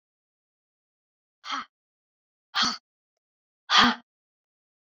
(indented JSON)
{
  "exhalation_length": "4.9 s",
  "exhalation_amplitude": 21432,
  "exhalation_signal_mean_std_ratio": 0.24,
  "survey_phase": "beta (2021-08-13 to 2022-03-07)",
  "age": "45-64",
  "gender": "Female",
  "wearing_mask": "No",
  "symptom_cough_any": true,
  "symptom_new_continuous_cough": true,
  "symptom_runny_or_blocked_nose": true,
  "symptom_sore_throat": true,
  "symptom_fatigue": true,
  "symptom_change_to_sense_of_smell_or_taste": true,
  "symptom_onset": "4 days",
  "smoker_status": "Never smoked",
  "respiratory_condition_asthma": false,
  "respiratory_condition_other": false,
  "recruitment_source": "Test and Trace",
  "submission_delay": "2 days",
  "covid_test_result": "Positive",
  "covid_test_method": "ePCR"
}